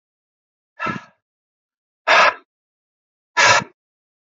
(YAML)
exhalation_length: 4.3 s
exhalation_amplitude: 27853
exhalation_signal_mean_std_ratio: 0.3
survey_phase: alpha (2021-03-01 to 2021-08-12)
age: 18-44
gender: Male
wearing_mask: 'No'
symptom_none: true
smoker_status: Never smoked
respiratory_condition_asthma: false
respiratory_condition_other: false
recruitment_source: REACT
submission_delay: 1 day
covid_test_result: Negative
covid_test_method: RT-qPCR